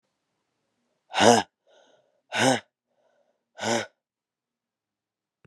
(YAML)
exhalation_length: 5.5 s
exhalation_amplitude: 26022
exhalation_signal_mean_std_ratio: 0.26
survey_phase: beta (2021-08-13 to 2022-03-07)
age: 45-64
gender: Female
wearing_mask: 'No'
symptom_cough_any: true
symptom_runny_or_blocked_nose: true
symptom_shortness_of_breath: true
symptom_sore_throat: true
symptom_abdominal_pain: true
symptom_fatigue: true
symptom_fever_high_temperature: true
symptom_headache: true
symptom_change_to_sense_of_smell_or_taste: true
symptom_onset: 3 days
smoker_status: Never smoked
respiratory_condition_asthma: false
respiratory_condition_other: false
recruitment_source: Test and Trace
submission_delay: 2 days
covid_test_result: Positive
covid_test_method: RT-qPCR
covid_ct_value: 14.7
covid_ct_gene: ORF1ab gene
covid_ct_mean: 15.0
covid_viral_load: 12000000 copies/ml
covid_viral_load_category: High viral load (>1M copies/ml)